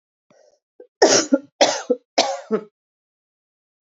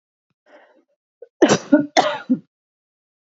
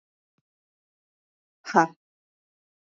{"three_cough_length": "3.9 s", "three_cough_amplitude": 29515, "three_cough_signal_mean_std_ratio": 0.34, "cough_length": "3.2 s", "cough_amplitude": 27392, "cough_signal_mean_std_ratio": 0.31, "exhalation_length": "3.0 s", "exhalation_amplitude": 22440, "exhalation_signal_mean_std_ratio": 0.15, "survey_phase": "alpha (2021-03-01 to 2021-08-12)", "age": "18-44", "gender": "Female", "wearing_mask": "No", "symptom_cough_any": true, "symptom_new_continuous_cough": true, "symptom_shortness_of_breath": true, "symptom_fatigue": true, "symptom_headache": true, "symptom_change_to_sense_of_smell_or_taste": true, "symptom_onset": "3 days", "smoker_status": "Never smoked", "respiratory_condition_asthma": false, "respiratory_condition_other": false, "recruitment_source": "Test and Trace", "submission_delay": "2 days", "covid_test_result": "Positive", "covid_test_method": "RT-qPCR"}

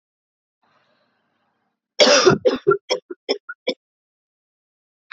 {"cough_length": "5.1 s", "cough_amplitude": 32767, "cough_signal_mean_std_ratio": 0.3, "survey_phase": "beta (2021-08-13 to 2022-03-07)", "age": "18-44", "gender": "Female", "wearing_mask": "No", "symptom_runny_or_blocked_nose": true, "symptom_shortness_of_breath": true, "symptom_fatigue": true, "symptom_fever_high_temperature": true, "symptom_headache": true, "symptom_change_to_sense_of_smell_or_taste": true, "symptom_loss_of_taste": true, "smoker_status": "Never smoked", "respiratory_condition_asthma": false, "respiratory_condition_other": true, "recruitment_source": "Test and Trace", "submission_delay": "2 days", "covid_test_result": "Positive", "covid_test_method": "RT-qPCR", "covid_ct_value": 21.0, "covid_ct_gene": "N gene", "covid_ct_mean": 21.5, "covid_viral_load": "86000 copies/ml", "covid_viral_load_category": "Low viral load (10K-1M copies/ml)"}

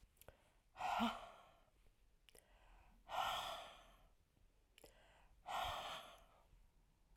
{"exhalation_length": "7.2 s", "exhalation_amplitude": 1220, "exhalation_signal_mean_std_ratio": 0.45, "survey_phase": "alpha (2021-03-01 to 2021-08-12)", "age": "45-64", "gender": "Female", "wearing_mask": "No", "symptom_cough_any": true, "symptom_shortness_of_breath": true, "symptom_fatigue": true, "symptom_headache": true, "smoker_status": "Current smoker (1 to 10 cigarettes per day)", "respiratory_condition_asthma": false, "respiratory_condition_other": false, "recruitment_source": "Test and Trace", "submission_delay": "1 day", "covid_test_result": "Positive", "covid_test_method": "RT-qPCR", "covid_ct_value": 15.2, "covid_ct_gene": "S gene", "covid_ct_mean": 15.6, "covid_viral_load": "7600000 copies/ml", "covid_viral_load_category": "High viral load (>1M copies/ml)"}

